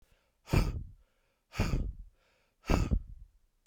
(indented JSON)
{
  "exhalation_length": "3.7 s",
  "exhalation_amplitude": 7440,
  "exhalation_signal_mean_std_ratio": 0.42,
  "survey_phase": "beta (2021-08-13 to 2022-03-07)",
  "age": "45-64",
  "gender": "Male",
  "wearing_mask": "No",
  "symptom_none": true,
  "smoker_status": "Never smoked",
  "respiratory_condition_asthma": true,
  "respiratory_condition_other": false,
  "recruitment_source": "REACT",
  "submission_delay": "1 day",
  "covid_test_result": "Negative",
  "covid_test_method": "RT-qPCR"
}